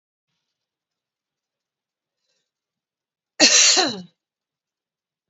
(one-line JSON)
{"cough_length": "5.3 s", "cough_amplitude": 32768, "cough_signal_mean_std_ratio": 0.25, "survey_phase": "beta (2021-08-13 to 2022-03-07)", "age": "45-64", "gender": "Female", "wearing_mask": "No", "symptom_runny_or_blocked_nose": true, "symptom_fatigue": true, "symptom_other": true, "symptom_onset": "3 days", "smoker_status": "Current smoker (e-cigarettes or vapes only)", "respiratory_condition_asthma": false, "respiratory_condition_other": false, "recruitment_source": "Test and Trace", "submission_delay": "2 days", "covid_test_result": "Positive", "covid_test_method": "RT-qPCR", "covid_ct_value": 24.9, "covid_ct_gene": "N gene"}